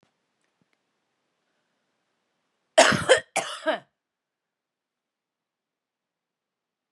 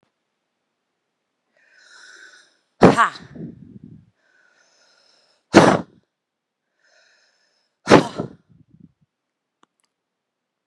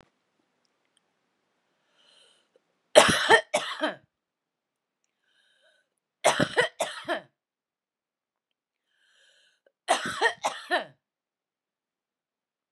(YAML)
cough_length: 6.9 s
cough_amplitude: 27825
cough_signal_mean_std_ratio: 0.2
exhalation_length: 10.7 s
exhalation_amplitude: 32768
exhalation_signal_mean_std_ratio: 0.2
three_cough_length: 12.7 s
three_cough_amplitude: 30853
three_cough_signal_mean_std_ratio: 0.25
survey_phase: beta (2021-08-13 to 2022-03-07)
age: 18-44
gender: Female
wearing_mask: 'No'
symptom_cough_any: true
symptom_diarrhoea: true
symptom_fatigue: true
symptom_headache: true
symptom_onset: 13 days
smoker_status: Current smoker (1 to 10 cigarettes per day)
respiratory_condition_asthma: true
respiratory_condition_other: false
recruitment_source: REACT
submission_delay: 2 days
covid_test_result: Negative
covid_test_method: RT-qPCR
influenza_a_test_result: Negative
influenza_b_test_result: Negative